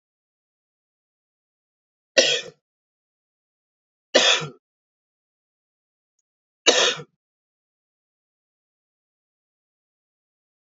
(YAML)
three_cough_length: 10.7 s
three_cough_amplitude: 32762
three_cough_signal_mean_std_ratio: 0.2
survey_phase: beta (2021-08-13 to 2022-03-07)
age: 18-44
gender: Male
wearing_mask: 'No'
symptom_cough_any: true
symptom_runny_or_blocked_nose: true
symptom_fatigue: true
symptom_other: true
symptom_onset: 4 days
smoker_status: Ex-smoker
respiratory_condition_asthma: false
respiratory_condition_other: false
recruitment_source: Test and Trace
submission_delay: 2 days
covid_test_result: Positive
covid_test_method: RT-qPCR
covid_ct_value: 14.2
covid_ct_gene: ORF1ab gene
covid_ct_mean: 14.6
covid_viral_load: 16000000 copies/ml
covid_viral_load_category: High viral load (>1M copies/ml)